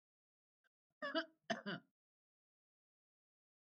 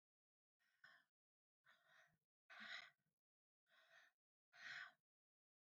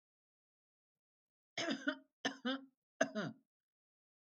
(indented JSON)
{
  "cough_length": "3.8 s",
  "cough_amplitude": 1277,
  "cough_signal_mean_std_ratio": 0.26,
  "exhalation_length": "5.7 s",
  "exhalation_amplitude": 254,
  "exhalation_signal_mean_std_ratio": 0.34,
  "three_cough_length": "4.4 s",
  "three_cough_amplitude": 4318,
  "three_cough_signal_mean_std_ratio": 0.32,
  "survey_phase": "beta (2021-08-13 to 2022-03-07)",
  "age": "45-64",
  "gender": "Female",
  "wearing_mask": "No",
  "symptom_none": true,
  "smoker_status": "Never smoked",
  "respiratory_condition_asthma": false,
  "respiratory_condition_other": false,
  "recruitment_source": "REACT",
  "submission_delay": "3 days",
  "covid_test_result": "Negative",
  "covid_test_method": "RT-qPCR",
  "influenza_a_test_result": "Negative",
  "influenza_b_test_result": "Negative"
}